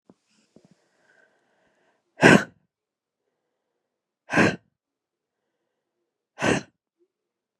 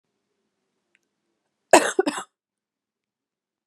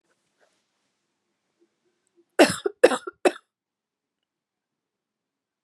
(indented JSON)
{
  "exhalation_length": "7.6 s",
  "exhalation_amplitude": 31947,
  "exhalation_signal_mean_std_ratio": 0.2,
  "cough_length": "3.7 s",
  "cough_amplitude": 32767,
  "cough_signal_mean_std_ratio": 0.18,
  "three_cough_length": "5.6 s",
  "three_cough_amplitude": 30660,
  "three_cough_signal_mean_std_ratio": 0.17,
  "survey_phase": "beta (2021-08-13 to 2022-03-07)",
  "age": "18-44",
  "gender": "Female",
  "wearing_mask": "No",
  "symptom_cough_any": true,
  "symptom_new_continuous_cough": true,
  "symptom_runny_or_blocked_nose": true,
  "symptom_shortness_of_breath": true,
  "symptom_sore_throat": true,
  "symptom_fatigue": true,
  "symptom_headache": true,
  "symptom_change_to_sense_of_smell_or_taste": true,
  "symptom_loss_of_taste": true,
  "symptom_onset": "3 days",
  "smoker_status": "Never smoked",
  "respiratory_condition_asthma": false,
  "respiratory_condition_other": false,
  "recruitment_source": "Test and Trace",
  "submission_delay": "2 days",
  "covid_test_result": "Positive",
  "covid_test_method": "RT-qPCR",
  "covid_ct_value": 16.6,
  "covid_ct_gene": "ORF1ab gene",
  "covid_ct_mean": 17.3,
  "covid_viral_load": "2200000 copies/ml",
  "covid_viral_load_category": "High viral load (>1M copies/ml)"
}